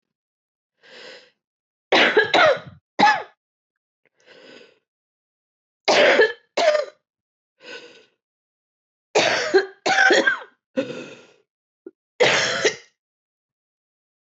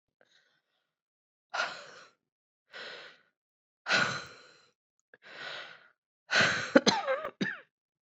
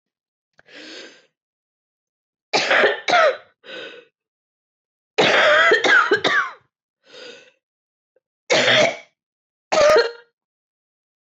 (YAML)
three_cough_length: 14.3 s
three_cough_amplitude: 19343
three_cough_signal_mean_std_ratio: 0.39
exhalation_length: 8.0 s
exhalation_amplitude: 17548
exhalation_signal_mean_std_ratio: 0.33
cough_length: 11.3 s
cough_amplitude: 19343
cough_signal_mean_std_ratio: 0.43
survey_phase: beta (2021-08-13 to 2022-03-07)
age: 45-64
gender: Female
wearing_mask: 'No'
symptom_new_continuous_cough: true
symptom_runny_or_blocked_nose: true
symptom_shortness_of_breath: true
symptom_sore_throat: true
symptom_diarrhoea: true
symptom_fatigue: true
symptom_fever_high_temperature: true
symptom_headache: true
symptom_other: true
symptom_onset: 3 days
smoker_status: Ex-smoker
respiratory_condition_asthma: false
respiratory_condition_other: false
recruitment_source: Test and Trace
submission_delay: 1 day
covid_test_result: Positive
covid_test_method: RT-qPCR
covid_ct_value: 19.5
covid_ct_gene: ORF1ab gene